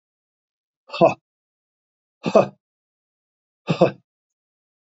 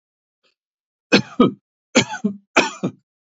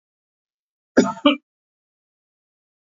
{"exhalation_length": "4.9 s", "exhalation_amplitude": 27103, "exhalation_signal_mean_std_ratio": 0.22, "three_cough_length": "3.3 s", "three_cough_amplitude": 32767, "three_cough_signal_mean_std_ratio": 0.32, "cough_length": "2.8 s", "cough_amplitude": 28504, "cough_signal_mean_std_ratio": 0.22, "survey_phase": "beta (2021-08-13 to 2022-03-07)", "age": "65+", "gender": "Male", "wearing_mask": "No", "symptom_none": true, "smoker_status": "Ex-smoker", "respiratory_condition_asthma": false, "respiratory_condition_other": false, "recruitment_source": "REACT", "submission_delay": "1 day", "covid_test_result": "Negative", "covid_test_method": "RT-qPCR", "influenza_a_test_result": "Negative", "influenza_b_test_result": "Negative"}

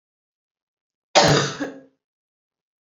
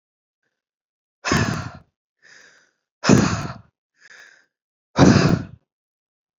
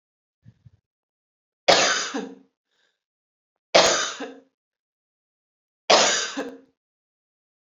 {"cough_length": "2.9 s", "cough_amplitude": 28920, "cough_signal_mean_std_ratio": 0.3, "exhalation_length": "6.4 s", "exhalation_amplitude": 27584, "exhalation_signal_mean_std_ratio": 0.32, "three_cough_length": "7.7 s", "three_cough_amplitude": 28997, "three_cough_signal_mean_std_ratio": 0.31, "survey_phase": "beta (2021-08-13 to 2022-03-07)", "age": "18-44", "gender": "Female", "wearing_mask": "No", "symptom_none": true, "smoker_status": "Never smoked", "respiratory_condition_asthma": true, "respiratory_condition_other": false, "recruitment_source": "REACT", "submission_delay": "2 days", "covid_test_result": "Negative", "covid_test_method": "RT-qPCR", "influenza_a_test_result": "Negative", "influenza_b_test_result": "Negative"}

